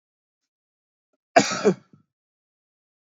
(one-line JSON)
{"cough_length": "3.2 s", "cough_amplitude": 28511, "cough_signal_mean_std_ratio": 0.21, "survey_phase": "beta (2021-08-13 to 2022-03-07)", "age": "45-64", "gender": "Male", "wearing_mask": "No", "symptom_none": true, "smoker_status": "Never smoked", "respiratory_condition_asthma": false, "respiratory_condition_other": false, "recruitment_source": "REACT", "submission_delay": "3 days", "covid_test_result": "Negative", "covid_test_method": "RT-qPCR", "influenza_a_test_result": "Negative", "influenza_b_test_result": "Negative"}